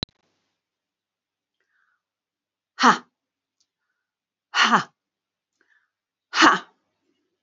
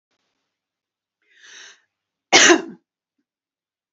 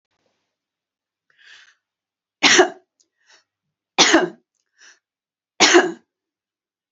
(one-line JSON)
{"exhalation_length": "7.4 s", "exhalation_amplitude": 27406, "exhalation_signal_mean_std_ratio": 0.22, "cough_length": "3.9 s", "cough_amplitude": 30006, "cough_signal_mean_std_ratio": 0.22, "three_cough_length": "6.9 s", "three_cough_amplitude": 31070, "three_cough_signal_mean_std_ratio": 0.27, "survey_phase": "alpha (2021-03-01 to 2021-08-12)", "age": "65+", "gender": "Female", "wearing_mask": "No", "symptom_none": true, "smoker_status": "Never smoked", "respiratory_condition_asthma": false, "respiratory_condition_other": false, "recruitment_source": "REACT", "submission_delay": "4 days", "covid_test_result": "Negative", "covid_test_method": "RT-qPCR"}